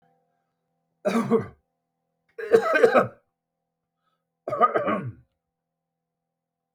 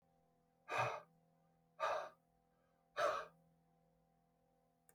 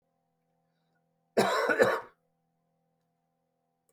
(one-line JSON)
{"three_cough_length": "6.7 s", "three_cough_amplitude": 21779, "three_cough_signal_mean_std_ratio": 0.35, "exhalation_length": "4.9 s", "exhalation_amplitude": 1609, "exhalation_signal_mean_std_ratio": 0.35, "cough_length": "3.9 s", "cough_amplitude": 10728, "cough_signal_mean_std_ratio": 0.31, "survey_phase": "beta (2021-08-13 to 2022-03-07)", "age": "45-64", "gender": "Male", "wearing_mask": "No", "symptom_none": true, "smoker_status": "Ex-smoker", "respiratory_condition_asthma": false, "respiratory_condition_other": false, "recruitment_source": "REACT", "submission_delay": "3 days", "covid_test_result": "Negative", "covid_test_method": "RT-qPCR", "influenza_a_test_result": "Unknown/Void", "influenza_b_test_result": "Unknown/Void"}